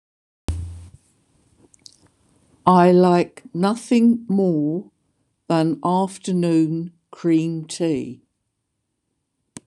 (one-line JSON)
{"exhalation_length": "9.7 s", "exhalation_amplitude": 26027, "exhalation_signal_mean_std_ratio": 0.52, "survey_phase": "beta (2021-08-13 to 2022-03-07)", "age": "65+", "gender": "Female", "wearing_mask": "No", "symptom_none": true, "smoker_status": "Ex-smoker", "respiratory_condition_asthma": false, "respiratory_condition_other": false, "recruitment_source": "REACT", "submission_delay": "3 days", "covid_test_result": "Negative", "covid_test_method": "RT-qPCR", "influenza_a_test_result": "Negative", "influenza_b_test_result": "Negative"}